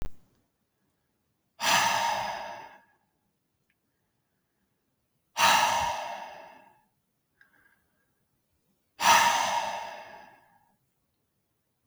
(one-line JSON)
{"exhalation_length": "11.9 s", "exhalation_amplitude": 14940, "exhalation_signal_mean_std_ratio": 0.37, "survey_phase": "beta (2021-08-13 to 2022-03-07)", "age": "18-44", "gender": "Male", "wearing_mask": "No", "symptom_runny_or_blocked_nose": true, "symptom_change_to_sense_of_smell_or_taste": true, "smoker_status": "Never smoked", "respiratory_condition_asthma": false, "respiratory_condition_other": false, "recruitment_source": "Test and Trace", "submission_delay": "2 days", "covid_test_result": "Positive", "covid_test_method": "RT-qPCR", "covid_ct_value": 31.2, "covid_ct_gene": "ORF1ab gene", "covid_ct_mean": 33.1, "covid_viral_load": "14 copies/ml", "covid_viral_load_category": "Minimal viral load (< 10K copies/ml)"}